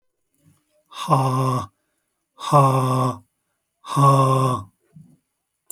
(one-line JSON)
{"exhalation_length": "5.7 s", "exhalation_amplitude": 26412, "exhalation_signal_mean_std_ratio": 0.48, "survey_phase": "alpha (2021-03-01 to 2021-08-12)", "age": "45-64", "gender": "Male", "wearing_mask": "No", "symptom_headache": true, "smoker_status": "Never smoked", "respiratory_condition_asthma": false, "respiratory_condition_other": false, "recruitment_source": "REACT", "submission_delay": "2 days", "covid_test_result": "Negative", "covid_test_method": "RT-qPCR"}